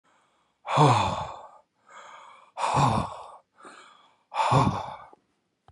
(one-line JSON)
{"exhalation_length": "5.7 s", "exhalation_amplitude": 16330, "exhalation_signal_mean_std_ratio": 0.44, "survey_phase": "beta (2021-08-13 to 2022-03-07)", "age": "65+", "gender": "Male", "wearing_mask": "No", "symptom_sore_throat": true, "symptom_onset": "8 days", "smoker_status": "Ex-smoker", "respiratory_condition_asthma": false, "respiratory_condition_other": false, "recruitment_source": "REACT", "submission_delay": "2 days", "covid_test_result": "Negative", "covid_test_method": "RT-qPCR", "influenza_a_test_result": "Negative", "influenza_b_test_result": "Negative"}